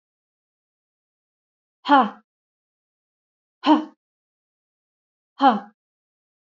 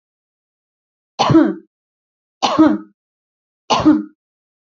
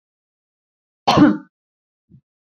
exhalation_length: 6.6 s
exhalation_amplitude: 25253
exhalation_signal_mean_std_ratio: 0.22
three_cough_length: 4.6 s
three_cough_amplitude: 28869
three_cough_signal_mean_std_ratio: 0.37
cough_length: 2.5 s
cough_amplitude: 27450
cough_signal_mean_std_ratio: 0.27
survey_phase: beta (2021-08-13 to 2022-03-07)
age: 18-44
gender: Female
wearing_mask: 'No'
symptom_none: true
smoker_status: Never smoked
respiratory_condition_asthma: false
respiratory_condition_other: false
recruitment_source: REACT
submission_delay: 1 day
covid_test_result: Negative
covid_test_method: RT-qPCR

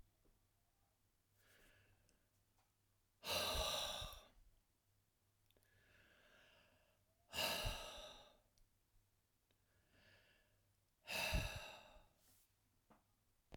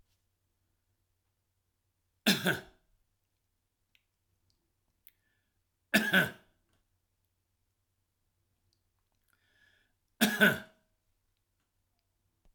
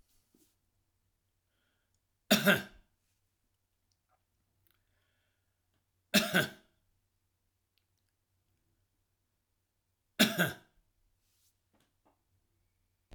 exhalation_length: 13.6 s
exhalation_amplitude: 1444
exhalation_signal_mean_std_ratio: 0.36
three_cough_length: 12.5 s
three_cough_amplitude: 8775
three_cough_signal_mean_std_ratio: 0.21
cough_length: 13.1 s
cough_amplitude: 10904
cough_signal_mean_std_ratio: 0.19
survey_phase: alpha (2021-03-01 to 2021-08-12)
age: 65+
gender: Male
wearing_mask: 'No'
symptom_abdominal_pain: true
symptom_onset: 10 days
smoker_status: Never smoked
respiratory_condition_asthma: false
respiratory_condition_other: false
recruitment_source: REACT
submission_delay: 2 days
covid_test_result: Negative
covid_test_method: RT-qPCR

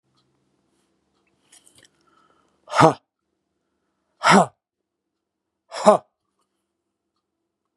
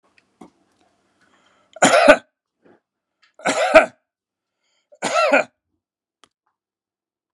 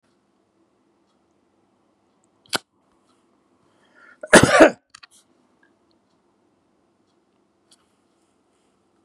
exhalation_length: 7.8 s
exhalation_amplitude: 32767
exhalation_signal_mean_std_ratio: 0.2
three_cough_length: 7.3 s
three_cough_amplitude: 32768
three_cough_signal_mean_std_ratio: 0.28
cough_length: 9.0 s
cough_amplitude: 32768
cough_signal_mean_std_ratio: 0.16
survey_phase: beta (2021-08-13 to 2022-03-07)
age: 65+
gender: Male
wearing_mask: 'No'
symptom_runny_or_blocked_nose: true
smoker_status: Ex-smoker
respiratory_condition_asthma: false
respiratory_condition_other: false
recruitment_source: REACT
submission_delay: 1 day
covid_test_result: Negative
covid_test_method: RT-qPCR
influenza_a_test_result: Negative
influenza_b_test_result: Negative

